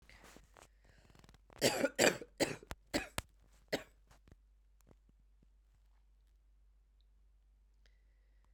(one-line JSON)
{"cough_length": "8.5 s", "cough_amplitude": 7360, "cough_signal_mean_std_ratio": 0.26, "survey_phase": "beta (2021-08-13 to 2022-03-07)", "age": "45-64", "gender": "Female", "wearing_mask": "No", "symptom_cough_any": true, "symptom_runny_or_blocked_nose": true, "symptom_shortness_of_breath": true, "symptom_abdominal_pain": true, "symptom_fatigue": true, "symptom_fever_high_temperature": true, "symptom_change_to_sense_of_smell_or_taste": true, "symptom_loss_of_taste": true, "symptom_onset": "2 days", "smoker_status": "Ex-smoker", "respiratory_condition_asthma": false, "respiratory_condition_other": false, "recruitment_source": "Test and Trace", "submission_delay": "2 days", "covid_test_method": "RT-qPCR", "covid_ct_value": 20.6, "covid_ct_gene": "ORF1ab gene"}